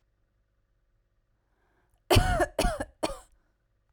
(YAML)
three_cough_length: 3.9 s
three_cough_amplitude: 14273
three_cough_signal_mean_std_ratio: 0.31
survey_phase: beta (2021-08-13 to 2022-03-07)
age: 18-44
gender: Female
wearing_mask: 'No'
symptom_none: true
smoker_status: Never smoked
respiratory_condition_asthma: false
respiratory_condition_other: false
recruitment_source: REACT
submission_delay: 0 days
covid_test_result: Negative
covid_test_method: RT-qPCR